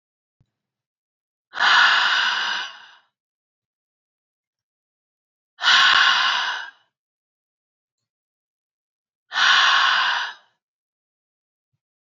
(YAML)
exhalation_length: 12.1 s
exhalation_amplitude: 24437
exhalation_signal_mean_std_ratio: 0.4
survey_phase: beta (2021-08-13 to 2022-03-07)
age: 45-64
gender: Female
wearing_mask: 'No'
symptom_none: true
smoker_status: Ex-smoker
respiratory_condition_asthma: false
respiratory_condition_other: false
recruitment_source: Test and Trace
submission_delay: 3 days
covid_test_result: Negative
covid_test_method: LFT